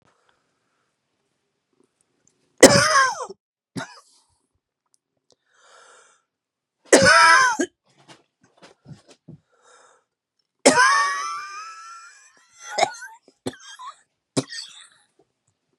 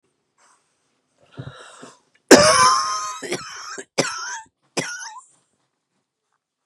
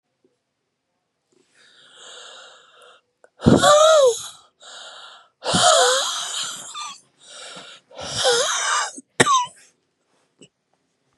three_cough_length: 15.8 s
three_cough_amplitude: 32768
three_cough_signal_mean_std_ratio: 0.29
cough_length: 6.7 s
cough_amplitude: 32768
cough_signal_mean_std_ratio: 0.32
exhalation_length: 11.2 s
exhalation_amplitude: 32767
exhalation_signal_mean_std_ratio: 0.42
survey_phase: beta (2021-08-13 to 2022-03-07)
age: 45-64
gender: Female
wearing_mask: 'No'
symptom_cough_any: true
symptom_new_continuous_cough: true
symptom_sore_throat: true
symptom_fatigue: true
symptom_fever_high_temperature: true
symptom_headache: true
symptom_other: true
symptom_onset: 3 days
smoker_status: Never smoked
respiratory_condition_asthma: false
respiratory_condition_other: false
recruitment_source: Test and Trace
submission_delay: 2 days
covid_test_result: Positive
covid_test_method: RT-qPCR
covid_ct_value: 27.5
covid_ct_gene: ORF1ab gene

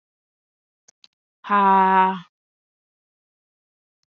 exhalation_length: 4.1 s
exhalation_amplitude: 19433
exhalation_signal_mean_std_ratio: 0.34
survey_phase: beta (2021-08-13 to 2022-03-07)
age: 18-44
gender: Female
wearing_mask: 'No'
symptom_none: true
smoker_status: Never smoked
respiratory_condition_asthma: false
respiratory_condition_other: false
recruitment_source: REACT
submission_delay: 4 days
covid_test_result: Negative
covid_test_method: RT-qPCR
influenza_a_test_result: Negative
influenza_b_test_result: Negative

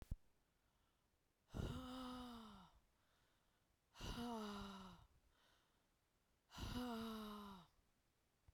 exhalation_length: 8.5 s
exhalation_amplitude: 697
exhalation_signal_mean_std_ratio: 0.54
survey_phase: beta (2021-08-13 to 2022-03-07)
age: 45-64
gender: Female
wearing_mask: 'No'
symptom_new_continuous_cough: true
symptom_runny_or_blocked_nose: true
symptom_shortness_of_breath: true
symptom_sore_throat: true
symptom_fever_high_temperature: true
symptom_headache: true
smoker_status: Never smoked
respiratory_condition_asthma: false
respiratory_condition_other: false
recruitment_source: Test and Trace
submission_delay: 0 days
covid_test_result: Positive
covid_test_method: LFT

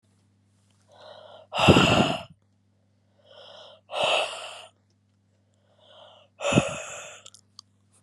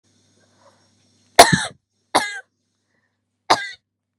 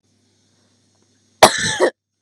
exhalation_length: 8.0 s
exhalation_amplitude: 29928
exhalation_signal_mean_std_ratio: 0.33
three_cough_length: 4.2 s
three_cough_amplitude: 32768
three_cough_signal_mean_std_ratio: 0.22
cough_length: 2.2 s
cough_amplitude: 32768
cough_signal_mean_std_ratio: 0.28
survey_phase: beta (2021-08-13 to 2022-03-07)
age: 18-44
gender: Female
wearing_mask: 'No'
symptom_cough_any: true
symptom_runny_or_blocked_nose: true
symptom_fatigue: true
symptom_change_to_sense_of_smell_or_taste: true
symptom_onset: 6 days
smoker_status: Never smoked
respiratory_condition_asthma: false
respiratory_condition_other: false
recruitment_source: REACT
submission_delay: 6 days
covid_test_result: Negative
covid_test_method: RT-qPCR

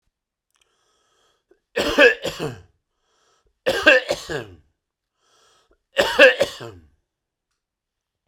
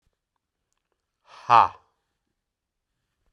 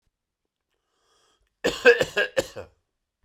three_cough_length: 8.3 s
three_cough_amplitude: 32768
three_cough_signal_mean_std_ratio: 0.29
exhalation_length: 3.3 s
exhalation_amplitude: 25546
exhalation_signal_mean_std_ratio: 0.16
cough_length: 3.2 s
cough_amplitude: 24136
cough_signal_mean_std_ratio: 0.27
survey_phase: beta (2021-08-13 to 2022-03-07)
age: 45-64
gender: Male
wearing_mask: 'No'
symptom_none: true
smoker_status: Never smoked
respiratory_condition_asthma: false
respiratory_condition_other: false
recruitment_source: REACT
submission_delay: 5 days
covid_test_result: Negative
covid_test_method: RT-qPCR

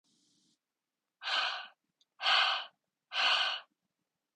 exhalation_length: 4.4 s
exhalation_amplitude: 5310
exhalation_signal_mean_std_ratio: 0.43
survey_phase: beta (2021-08-13 to 2022-03-07)
age: 18-44
gender: Female
wearing_mask: 'No'
symptom_none: true
smoker_status: Never smoked
respiratory_condition_asthma: false
respiratory_condition_other: false
recruitment_source: REACT
submission_delay: 9 days
covid_test_result: Negative
covid_test_method: RT-qPCR
influenza_a_test_result: Negative
influenza_b_test_result: Negative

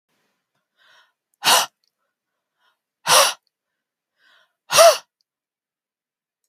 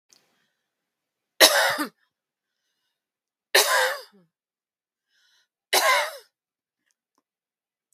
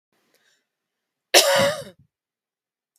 exhalation_length: 6.5 s
exhalation_amplitude: 32768
exhalation_signal_mean_std_ratio: 0.25
three_cough_length: 7.9 s
three_cough_amplitude: 32768
three_cough_signal_mean_std_ratio: 0.29
cough_length: 3.0 s
cough_amplitude: 32768
cough_signal_mean_std_ratio: 0.29
survey_phase: beta (2021-08-13 to 2022-03-07)
age: 45-64
gender: Female
wearing_mask: 'No'
symptom_none: true
smoker_status: Ex-smoker
respiratory_condition_asthma: true
respiratory_condition_other: false
recruitment_source: REACT
submission_delay: 0 days
covid_test_result: Negative
covid_test_method: RT-qPCR
influenza_a_test_result: Unknown/Void
influenza_b_test_result: Unknown/Void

